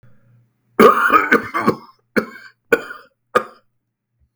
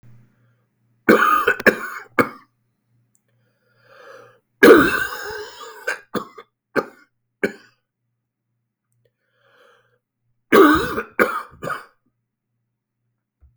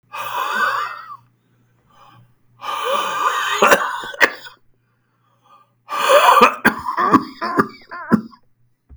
{"cough_length": "4.4 s", "cough_amplitude": 32768, "cough_signal_mean_std_ratio": 0.36, "three_cough_length": "13.6 s", "three_cough_amplitude": 32768, "three_cough_signal_mean_std_ratio": 0.3, "exhalation_length": "9.0 s", "exhalation_amplitude": 32768, "exhalation_signal_mean_std_ratio": 0.48, "survey_phase": "beta (2021-08-13 to 2022-03-07)", "age": "45-64", "gender": "Male", "wearing_mask": "No", "symptom_cough_any": true, "symptom_runny_or_blocked_nose": true, "symptom_shortness_of_breath": true, "symptom_fatigue": true, "smoker_status": "Ex-smoker", "respiratory_condition_asthma": false, "respiratory_condition_other": true, "recruitment_source": "Test and Trace", "submission_delay": "3 days", "covid_test_result": "Negative", "covid_test_method": "RT-qPCR"}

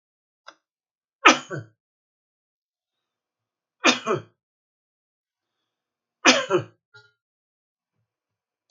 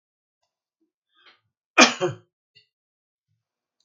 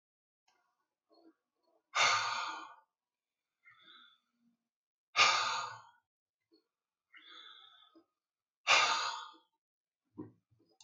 {"three_cough_length": "8.7 s", "three_cough_amplitude": 32767, "three_cough_signal_mean_std_ratio": 0.2, "cough_length": "3.8 s", "cough_amplitude": 32767, "cough_signal_mean_std_ratio": 0.17, "exhalation_length": "10.8 s", "exhalation_amplitude": 7002, "exhalation_signal_mean_std_ratio": 0.31, "survey_phase": "beta (2021-08-13 to 2022-03-07)", "age": "65+", "gender": "Male", "wearing_mask": "No", "symptom_none": true, "smoker_status": "Never smoked", "respiratory_condition_asthma": false, "respiratory_condition_other": false, "recruitment_source": "REACT", "submission_delay": "4 days", "covid_test_result": "Negative", "covid_test_method": "RT-qPCR", "influenza_a_test_result": "Negative", "influenza_b_test_result": "Negative"}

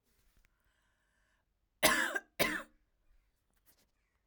{"cough_length": "4.3 s", "cough_amplitude": 7613, "cough_signal_mean_std_ratio": 0.27, "survey_phase": "alpha (2021-03-01 to 2021-08-12)", "age": "18-44", "gender": "Female", "wearing_mask": "No", "symptom_none": true, "smoker_status": "Ex-smoker", "respiratory_condition_asthma": false, "respiratory_condition_other": false, "recruitment_source": "REACT", "submission_delay": "1 day", "covid_test_result": "Negative", "covid_test_method": "RT-qPCR"}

